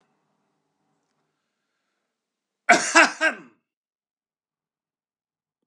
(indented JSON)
{
  "cough_length": "5.7 s",
  "cough_amplitude": 30323,
  "cough_signal_mean_std_ratio": 0.2,
  "survey_phase": "beta (2021-08-13 to 2022-03-07)",
  "age": "45-64",
  "gender": "Male",
  "wearing_mask": "No",
  "symptom_none": true,
  "smoker_status": "Current smoker (e-cigarettes or vapes only)",
  "respiratory_condition_asthma": false,
  "respiratory_condition_other": false,
  "recruitment_source": "REACT",
  "submission_delay": "2 days",
  "covid_test_result": "Negative",
  "covid_test_method": "RT-qPCR",
  "influenza_a_test_result": "Negative",
  "influenza_b_test_result": "Negative"
}